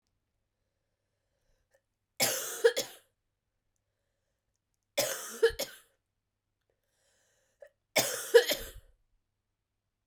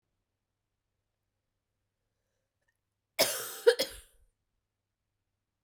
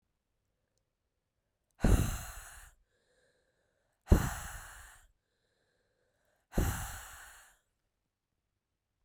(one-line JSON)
{"three_cough_length": "10.1 s", "three_cough_amplitude": 12475, "three_cough_signal_mean_std_ratio": 0.25, "cough_length": "5.6 s", "cough_amplitude": 11340, "cough_signal_mean_std_ratio": 0.18, "exhalation_length": "9.0 s", "exhalation_amplitude": 8639, "exhalation_signal_mean_std_ratio": 0.25, "survey_phase": "beta (2021-08-13 to 2022-03-07)", "age": "18-44", "gender": "Female", "wearing_mask": "No", "symptom_cough_any": true, "symptom_runny_or_blocked_nose": true, "symptom_headache": true, "symptom_change_to_sense_of_smell_or_taste": true, "symptom_onset": "4 days", "smoker_status": "Never smoked", "respiratory_condition_asthma": false, "respiratory_condition_other": false, "recruitment_source": "Test and Trace", "submission_delay": "3 days", "covid_test_result": "Positive", "covid_test_method": "RT-qPCR", "covid_ct_value": 17.9, "covid_ct_gene": "ORF1ab gene", "covid_ct_mean": 19.1, "covid_viral_load": "530000 copies/ml", "covid_viral_load_category": "Low viral load (10K-1M copies/ml)"}